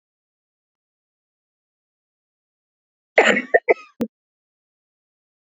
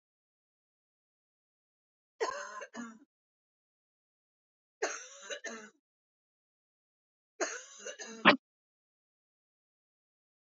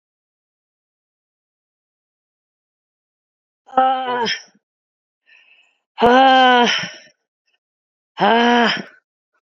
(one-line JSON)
{"cough_length": "5.5 s", "cough_amplitude": 28213, "cough_signal_mean_std_ratio": 0.19, "three_cough_length": "10.5 s", "three_cough_amplitude": 13230, "three_cough_signal_mean_std_ratio": 0.2, "exhalation_length": "9.6 s", "exhalation_amplitude": 29635, "exhalation_signal_mean_std_ratio": 0.36, "survey_phase": "beta (2021-08-13 to 2022-03-07)", "age": "45-64", "gender": "Female", "wearing_mask": "Yes", "symptom_cough_any": true, "symptom_runny_or_blocked_nose": true, "symptom_fatigue": true, "symptom_change_to_sense_of_smell_or_taste": true, "symptom_onset": "3 days", "smoker_status": "Never smoked", "respiratory_condition_asthma": false, "respiratory_condition_other": false, "recruitment_source": "Test and Trace", "submission_delay": "2 days", "covid_test_result": "Positive", "covid_test_method": "RT-qPCR", "covid_ct_value": 24.2, "covid_ct_gene": "N gene"}